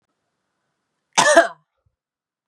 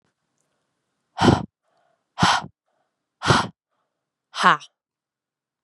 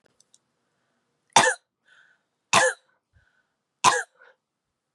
cough_length: 2.5 s
cough_amplitude: 32767
cough_signal_mean_std_ratio: 0.26
exhalation_length: 5.6 s
exhalation_amplitude: 30933
exhalation_signal_mean_std_ratio: 0.28
three_cough_length: 4.9 s
three_cough_amplitude: 30344
three_cough_signal_mean_std_ratio: 0.25
survey_phase: beta (2021-08-13 to 2022-03-07)
age: 18-44
gender: Female
wearing_mask: 'No'
symptom_cough_any: true
symptom_runny_or_blocked_nose: true
symptom_headache: true
smoker_status: Current smoker (e-cigarettes or vapes only)
respiratory_condition_asthma: false
respiratory_condition_other: false
recruitment_source: Test and Trace
submission_delay: 1 day
covid_test_result: Positive
covid_test_method: RT-qPCR
covid_ct_value: 17.4
covid_ct_gene: N gene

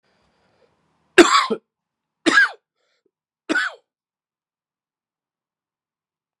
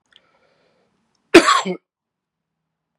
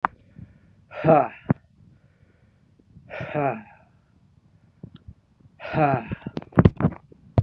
three_cough_length: 6.4 s
three_cough_amplitude: 32768
three_cough_signal_mean_std_ratio: 0.24
cough_length: 3.0 s
cough_amplitude: 32768
cough_signal_mean_std_ratio: 0.22
exhalation_length: 7.4 s
exhalation_amplitude: 32768
exhalation_signal_mean_std_ratio: 0.31
survey_phase: beta (2021-08-13 to 2022-03-07)
age: 45-64
gender: Male
wearing_mask: 'No'
symptom_cough_any: true
symptom_runny_or_blocked_nose: true
symptom_sore_throat: true
symptom_diarrhoea: true
symptom_fatigue: true
symptom_onset: 2 days
smoker_status: Ex-smoker
respiratory_condition_asthma: false
respiratory_condition_other: false
recruitment_source: Test and Trace
submission_delay: 1 day
covid_test_result: Positive
covid_test_method: RT-qPCR
covid_ct_value: 20.2
covid_ct_gene: ORF1ab gene
covid_ct_mean: 20.7
covid_viral_load: 160000 copies/ml
covid_viral_load_category: Low viral load (10K-1M copies/ml)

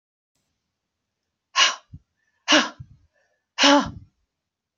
exhalation_length: 4.8 s
exhalation_amplitude: 24629
exhalation_signal_mean_std_ratio: 0.29
survey_phase: beta (2021-08-13 to 2022-03-07)
age: 45-64
gender: Female
wearing_mask: 'No'
symptom_none: true
smoker_status: Never smoked
respiratory_condition_asthma: false
respiratory_condition_other: false
recruitment_source: REACT
submission_delay: 2 days
covid_test_result: Negative
covid_test_method: RT-qPCR
influenza_a_test_result: Negative
influenza_b_test_result: Negative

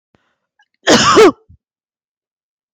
cough_length: 2.7 s
cough_amplitude: 31943
cough_signal_mean_std_ratio: 0.35
survey_phase: beta (2021-08-13 to 2022-03-07)
age: 18-44
gender: Female
wearing_mask: 'No'
symptom_none: true
smoker_status: Never smoked
respiratory_condition_asthma: false
respiratory_condition_other: false
recruitment_source: REACT
submission_delay: 1 day
covid_test_result: Negative
covid_test_method: RT-qPCR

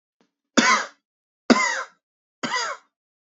three_cough_length: 3.3 s
three_cough_amplitude: 27710
three_cough_signal_mean_std_ratio: 0.37
survey_phase: beta (2021-08-13 to 2022-03-07)
age: 18-44
gender: Male
wearing_mask: 'No'
symptom_cough_any: true
symptom_runny_or_blocked_nose: true
symptom_onset: 12 days
smoker_status: Never smoked
respiratory_condition_asthma: false
respiratory_condition_other: false
recruitment_source: REACT
submission_delay: 2 days
covid_test_result: Negative
covid_test_method: RT-qPCR
influenza_a_test_result: Negative
influenza_b_test_result: Negative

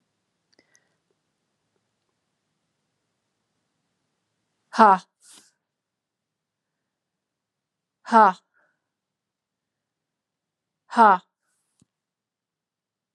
exhalation_length: 13.1 s
exhalation_amplitude: 30187
exhalation_signal_mean_std_ratio: 0.16
survey_phase: alpha (2021-03-01 to 2021-08-12)
age: 45-64
gender: Female
wearing_mask: 'No'
symptom_cough_any: true
symptom_abdominal_pain: true
symptom_fatigue: true
symptom_headache: true
symptom_change_to_sense_of_smell_or_taste: true
smoker_status: Never smoked
respiratory_condition_asthma: false
respiratory_condition_other: false
recruitment_source: Test and Trace
submission_delay: 2 days
covid_test_result: Positive
covid_test_method: RT-qPCR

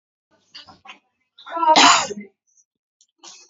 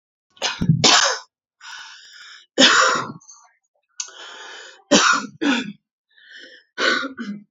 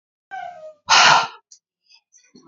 cough_length: 3.5 s
cough_amplitude: 29962
cough_signal_mean_std_ratio: 0.32
three_cough_length: 7.5 s
three_cough_amplitude: 32767
three_cough_signal_mean_std_ratio: 0.44
exhalation_length: 2.5 s
exhalation_amplitude: 28089
exhalation_signal_mean_std_ratio: 0.35
survey_phase: beta (2021-08-13 to 2022-03-07)
age: 18-44
gender: Female
wearing_mask: 'No'
symptom_cough_any: true
symptom_shortness_of_breath: true
symptom_fatigue: true
symptom_fever_high_temperature: true
symptom_headache: true
symptom_change_to_sense_of_smell_or_taste: true
symptom_other: true
smoker_status: Current smoker (1 to 10 cigarettes per day)
respiratory_condition_asthma: true
respiratory_condition_other: false
recruitment_source: Test and Trace
submission_delay: 1 day
covid_test_result: Positive
covid_test_method: RT-qPCR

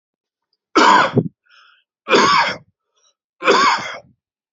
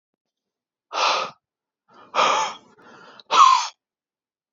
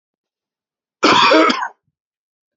three_cough_length: 4.5 s
three_cough_amplitude: 30887
three_cough_signal_mean_std_ratio: 0.45
exhalation_length: 4.5 s
exhalation_amplitude: 25560
exhalation_signal_mean_std_ratio: 0.37
cough_length: 2.6 s
cough_amplitude: 29546
cough_signal_mean_std_ratio: 0.41
survey_phase: beta (2021-08-13 to 2022-03-07)
age: 45-64
gender: Male
wearing_mask: 'No'
symptom_none: true
smoker_status: Never smoked
respiratory_condition_asthma: false
respiratory_condition_other: false
recruitment_source: REACT
submission_delay: 3 days
covid_test_result: Negative
covid_test_method: RT-qPCR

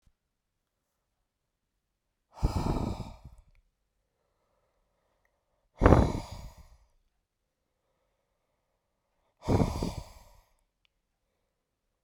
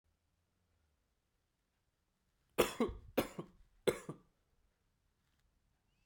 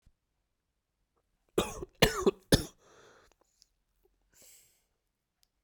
exhalation_length: 12.0 s
exhalation_amplitude: 26610
exhalation_signal_mean_std_ratio: 0.24
three_cough_length: 6.1 s
three_cough_amplitude: 5144
three_cough_signal_mean_std_ratio: 0.22
cough_length: 5.6 s
cough_amplitude: 17305
cough_signal_mean_std_ratio: 0.2
survey_phase: beta (2021-08-13 to 2022-03-07)
age: 18-44
gender: Male
wearing_mask: 'No'
symptom_cough_any: true
symptom_runny_or_blocked_nose: true
symptom_fatigue: true
symptom_headache: true
symptom_change_to_sense_of_smell_or_taste: true
symptom_onset: 4 days
smoker_status: Never smoked
respiratory_condition_asthma: false
respiratory_condition_other: false
recruitment_source: Test and Trace
submission_delay: 2 days
covid_test_result: Positive
covid_test_method: RT-qPCR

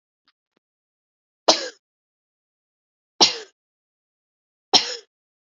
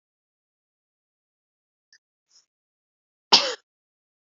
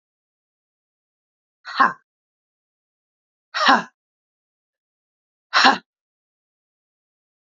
three_cough_length: 5.5 s
three_cough_amplitude: 32768
three_cough_signal_mean_std_ratio: 0.19
cough_length: 4.4 s
cough_amplitude: 27363
cough_signal_mean_std_ratio: 0.14
exhalation_length: 7.6 s
exhalation_amplitude: 28651
exhalation_signal_mean_std_ratio: 0.21
survey_phase: beta (2021-08-13 to 2022-03-07)
age: 45-64
gender: Female
wearing_mask: 'No'
symptom_cough_any: true
symptom_runny_or_blocked_nose: true
smoker_status: Never smoked
respiratory_condition_asthma: false
respiratory_condition_other: false
recruitment_source: REACT
submission_delay: 2 days
covid_test_result: Negative
covid_test_method: RT-qPCR
influenza_a_test_result: Negative
influenza_b_test_result: Negative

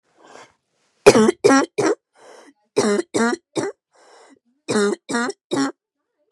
three_cough_length: 6.3 s
three_cough_amplitude: 32768
three_cough_signal_mean_std_ratio: 0.42
survey_phase: beta (2021-08-13 to 2022-03-07)
age: 18-44
gender: Female
wearing_mask: 'No'
symptom_none: true
symptom_onset: 3 days
smoker_status: Ex-smoker
respiratory_condition_asthma: false
respiratory_condition_other: false
recruitment_source: REACT
submission_delay: 4 days
covid_test_result: Negative
covid_test_method: RT-qPCR
influenza_a_test_result: Unknown/Void
influenza_b_test_result: Unknown/Void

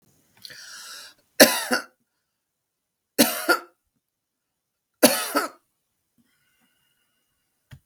three_cough_length: 7.9 s
three_cough_amplitude: 32768
three_cough_signal_mean_std_ratio: 0.24
survey_phase: beta (2021-08-13 to 2022-03-07)
age: 65+
gender: Female
wearing_mask: 'No'
symptom_runny_or_blocked_nose: true
symptom_diarrhoea: true
smoker_status: Ex-smoker
respiratory_condition_asthma: false
respiratory_condition_other: false
recruitment_source: REACT
submission_delay: 3 days
covid_test_result: Negative
covid_test_method: RT-qPCR
influenza_a_test_result: Negative
influenza_b_test_result: Negative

